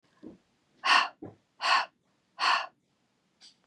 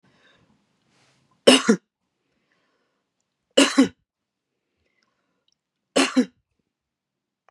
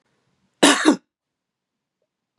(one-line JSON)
{"exhalation_length": "3.7 s", "exhalation_amplitude": 11039, "exhalation_signal_mean_std_ratio": 0.36, "three_cough_length": "7.5 s", "three_cough_amplitude": 32766, "three_cough_signal_mean_std_ratio": 0.23, "cough_length": "2.4 s", "cough_amplitude": 31817, "cough_signal_mean_std_ratio": 0.27, "survey_phase": "beta (2021-08-13 to 2022-03-07)", "age": "45-64", "gender": "Female", "wearing_mask": "No", "symptom_none": true, "smoker_status": "Never smoked", "respiratory_condition_asthma": false, "respiratory_condition_other": false, "recruitment_source": "REACT", "submission_delay": "1 day", "covid_test_result": "Negative", "covid_test_method": "RT-qPCR"}